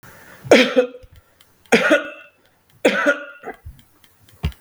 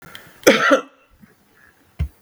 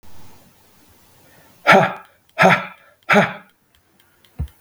{"three_cough_length": "4.6 s", "three_cough_amplitude": 32768, "three_cough_signal_mean_std_ratio": 0.38, "cough_length": "2.2 s", "cough_amplitude": 32768, "cough_signal_mean_std_ratio": 0.34, "exhalation_length": "4.6 s", "exhalation_amplitude": 32768, "exhalation_signal_mean_std_ratio": 0.34, "survey_phase": "beta (2021-08-13 to 2022-03-07)", "age": "45-64", "gender": "Male", "wearing_mask": "No", "symptom_none": true, "smoker_status": "Ex-smoker", "respiratory_condition_asthma": false, "respiratory_condition_other": false, "recruitment_source": "REACT", "submission_delay": "2 days", "covid_test_result": "Negative", "covid_test_method": "RT-qPCR", "influenza_a_test_result": "Negative", "influenza_b_test_result": "Negative"}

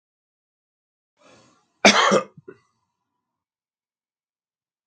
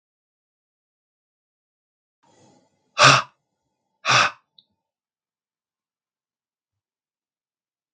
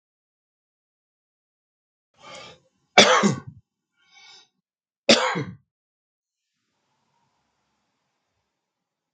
{"cough_length": "4.9 s", "cough_amplitude": 32768, "cough_signal_mean_std_ratio": 0.21, "exhalation_length": "7.9 s", "exhalation_amplitude": 32766, "exhalation_signal_mean_std_ratio": 0.18, "three_cough_length": "9.1 s", "three_cough_amplitude": 32691, "three_cough_signal_mean_std_ratio": 0.2, "survey_phase": "beta (2021-08-13 to 2022-03-07)", "age": "45-64", "gender": "Male", "wearing_mask": "No", "symptom_none": true, "smoker_status": "Never smoked", "respiratory_condition_asthma": false, "respiratory_condition_other": false, "recruitment_source": "REACT", "submission_delay": "6 days", "covid_test_result": "Negative", "covid_test_method": "RT-qPCR", "influenza_a_test_result": "Negative", "influenza_b_test_result": "Negative"}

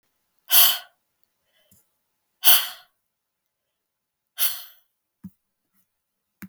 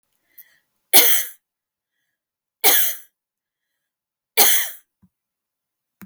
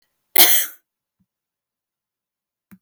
{"exhalation_length": "6.5 s", "exhalation_amplitude": 32767, "exhalation_signal_mean_std_ratio": 0.23, "three_cough_length": "6.1 s", "three_cough_amplitude": 32768, "three_cough_signal_mean_std_ratio": 0.31, "cough_length": "2.8 s", "cough_amplitude": 32768, "cough_signal_mean_std_ratio": 0.25, "survey_phase": "beta (2021-08-13 to 2022-03-07)", "age": "45-64", "gender": "Female", "wearing_mask": "No", "symptom_none": true, "smoker_status": "Never smoked", "respiratory_condition_asthma": false, "respiratory_condition_other": false, "recruitment_source": "REACT", "submission_delay": "1 day", "covid_test_result": "Negative", "covid_test_method": "RT-qPCR"}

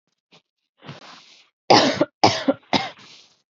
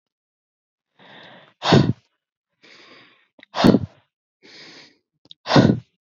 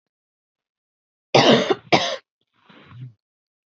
{"three_cough_length": "3.5 s", "three_cough_amplitude": 28885, "three_cough_signal_mean_std_ratio": 0.33, "exhalation_length": "6.1 s", "exhalation_amplitude": 32768, "exhalation_signal_mean_std_ratio": 0.28, "cough_length": "3.7 s", "cough_amplitude": 28345, "cough_signal_mean_std_ratio": 0.31, "survey_phase": "beta (2021-08-13 to 2022-03-07)", "age": "18-44", "gender": "Female", "wearing_mask": "No", "symptom_none": true, "smoker_status": "Never smoked", "respiratory_condition_asthma": false, "respiratory_condition_other": false, "recruitment_source": "REACT", "submission_delay": "3 days", "covid_test_result": "Negative", "covid_test_method": "RT-qPCR", "influenza_a_test_result": "Negative", "influenza_b_test_result": "Negative"}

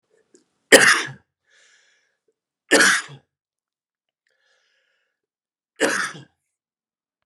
{"three_cough_length": "7.3 s", "three_cough_amplitude": 32768, "three_cough_signal_mean_std_ratio": 0.25, "survey_phase": "beta (2021-08-13 to 2022-03-07)", "age": "45-64", "gender": "Male", "wearing_mask": "Yes", "symptom_runny_or_blocked_nose": true, "symptom_sore_throat": true, "symptom_fever_high_temperature": true, "symptom_headache": true, "symptom_loss_of_taste": true, "symptom_other": true, "smoker_status": "Never smoked", "respiratory_condition_asthma": false, "respiratory_condition_other": false, "recruitment_source": "Test and Trace", "submission_delay": "2 days", "covid_test_result": "Positive", "covid_test_method": "RT-qPCR"}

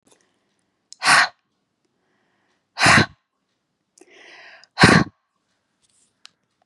{"exhalation_length": "6.7 s", "exhalation_amplitude": 32768, "exhalation_signal_mean_std_ratio": 0.26, "survey_phase": "beta (2021-08-13 to 2022-03-07)", "age": "45-64", "gender": "Female", "wearing_mask": "No", "symptom_none": true, "smoker_status": "Never smoked", "respiratory_condition_asthma": false, "respiratory_condition_other": false, "recruitment_source": "Test and Trace", "submission_delay": "2 days", "covid_test_result": "Positive", "covid_test_method": "RT-qPCR"}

